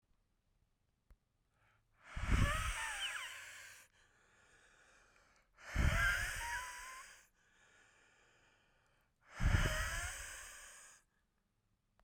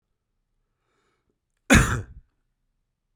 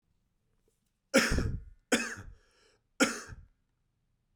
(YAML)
exhalation_length: 12.0 s
exhalation_amplitude: 3141
exhalation_signal_mean_std_ratio: 0.42
cough_length: 3.2 s
cough_amplitude: 24295
cough_signal_mean_std_ratio: 0.22
three_cough_length: 4.4 s
three_cough_amplitude: 11155
three_cough_signal_mean_std_ratio: 0.33
survey_phase: beta (2021-08-13 to 2022-03-07)
age: 18-44
gender: Male
wearing_mask: 'No'
symptom_cough_any: true
symptom_runny_or_blocked_nose: true
symptom_sore_throat: true
symptom_fatigue: true
symptom_fever_high_temperature: true
symptom_headache: true
symptom_onset: 4 days
smoker_status: Ex-smoker
respiratory_condition_asthma: false
respiratory_condition_other: false
recruitment_source: Test and Trace
submission_delay: 1 day
covid_test_result: Positive
covid_test_method: RT-qPCR
covid_ct_value: 17.9
covid_ct_gene: ORF1ab gene
covid_ct_mean: 18.2
covid_viral_load: 1000000 copies/ml
covid_viral_load_category: High viral load (>1M copies/ml)